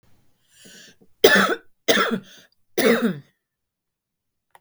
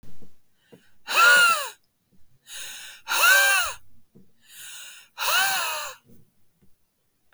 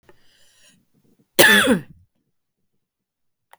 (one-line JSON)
{"three_cough_length": "4.6 s", "three_cough_amplitude": 32768, "three_cough_signal_mean_std_ratio": 0.36, "exhalation_length": "7.3 s", "exhalation_amplitude": 18102, "exhalation_signal_mean_std_ratio": 0.47, "cough_length": "3.6 s", "cough_amplitude": 32768, "cough_signal_mean_std_ratio": 0.28, "survey_phase": "beta (2021-08-13 to 2022-03-07)", "age": "45-64", "gender": "Female", "wearing_mask": "No", "symptom_runny_or_blocked_nose": true, "symptom_sore_throat": true, "symptom_fatigue": true, "symptom_headache": true, "symptom_onset": "3 days", "smoker_status": "Never smoked", "respiratory_condition_asthma": false, "respiratory_condition_other": false, "recruitment_source": "Test and Trace", "submission_delay": "2 days", "covid_test_result": "Positive", "covid_test_method": "RT-qPCR", "covid_ct_value": 17.1, "covid_ct_gene": "ORF1ab gene", "covid_ct_mean": 18.3, "covid_viral_load": "1000000 copies/ml", "covid_viral_load_category": "High viral load (>1M copies/ml)"}